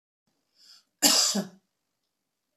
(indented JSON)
{
  "cough_length": "2.6 s",
  "cough_amplitude": 19536,
  "cough_signal_mean_std_ratio": 0.31,
  "survey_phase": "beta (2021-08-13 to 2022-03-07)",
  "age": "65+",
  "gender": "Female",
  "wearing_mask": "No",
  "symptom_none": true,
  "smoker_status": "Ex-smoker",
  "respiratory_condition_asthma": false,
  "respiratory_condition_other": false,
  "recruitment_source": "REACT",
  "submission_delay": "1 day",
  "covid_test_result": "Negative",
  "covid_test_method": "RT-qPCR"
}